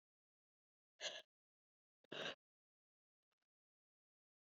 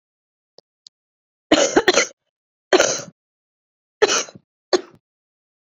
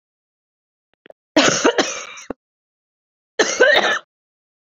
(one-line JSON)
{"exhalation_length": "4.5 s", "exhalation_amplitude": 695, "exhalation_signal_mean_std_ratio": 0.22, "cough_length": "5.7 s", "cough_amplitude": 32768, "cough_signal_mean_std_ratio": 0.3, "three_cough_length": "4.6 s", "three_cough_amplitude": 30320, "three_cough_signal_mean_std_ratio": 0.38, "survey_phase": "beta (2021-08-13 to 2022-03-07)", "age": "18-44", "gender": "Female", "wearing_mask": "No", "symptom_cough_any": true, "symptom_runny_or_blocked_nose": true, "symptom_abdominal_pain": true, "symptom_fever_high_temperature": true, "symptom_headache": true, "symptom_change_to_sense_of_smell_or_taste": true, "symptom_loss_of_taste": true, "symptom_onset": "2 days", "smoker_status": "Prefer not to say", "respiratory_condition_asthma": false, "respiratory_condition_other": false, "recruitment_source": "Test and Trace", "submission_delay": "2 days", "covid_test_result": "Positive", "covid_test_method": "RT-qPCR", "covid_ct_value": 15.7, "covid_ct_gene": "ORF1ab gene", "covid_ct_mean": 16.0, "covid_viral_load": "5600000 copies/ml", "covid_viral_load_category": "High viral load (>1M copies/ml)"}